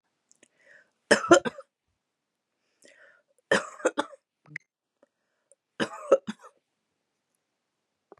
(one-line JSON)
{"three_cough_length": "8.2 s", "three_cough_amplitude": 23118, "three_cough_signal_mean_std_ratio": 0.2, "survey_phase": "beta (2021-08-13 to 2022-03-07)", "age": "45-64", "gender": "Female", "wearing_mask": "No", "symptom_none": true, "smoker_status": "Current smoker (11 or more cigarettes per day)", "respiratory_condition_asthma": false, "respiratory_condition_other": false, "recruitment_source": "REACT", "submission_delay": "4 days", "covid_test_result": "Negative", "covid_test_method": "RT-qPCR", "influenza_a_test_result": "Negative", "influenza_b_test_result": "Negative"}